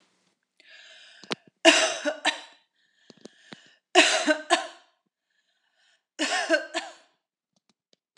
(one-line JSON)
{"three_cough_length": "8.2 s", "three_cough_amplitude": 25861, "three_cough_signal_mean_std_ratio": 0.32, "survey_phase": "beta (2021-08-13 to 2022-03-07)", "age": "45-64", "gender": "Female", "wearing_mask": "No", "symptom_none": true, "smoker_status": "Never smoked", "respiratory_condition_asthma": false, "respiratory_condition_other": false, "recruitment_source": "REACT", "submission_delay": "1 day", "covid_test_result": "Negative", "covid_test_method": "RT-qPCR"}